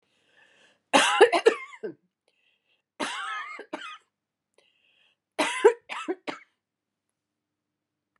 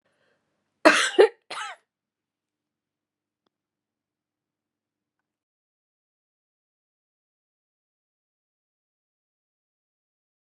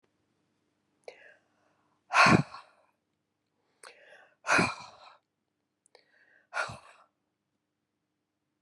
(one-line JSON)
{"three_cough_length": "8.2 s", "three_cough_amplitude": 24231, "three_cough_signal_mean_std_ratio": 0.28, "cough_length": "10.4 s", "cough_amplitude": 31852, "cough_signal_mean_std_ratio": 0.14, "exhalation_length": "8.6 s", "exhalation_amplitude": 13607, "exhalation_signal_mean_std_ratio": 0.22, "survey_phase": "beta (2021-08-13 to 2022-03-07)", "age": "65+", "gender": "Female", "wearing_mask": "No", "symptom_none": true, "smoker_status": "Never smoked", "respiratory_condition_asthma": true, "respiratory_condition_other": false, "recruitment_source": "REACT", "submission_delay": "2 days", "covid_test_result": "Negative", "covid_test_method": "RT-qPCR", "influenza_a_test_result": "Negative", "influenza_b_test_result": "Negative"}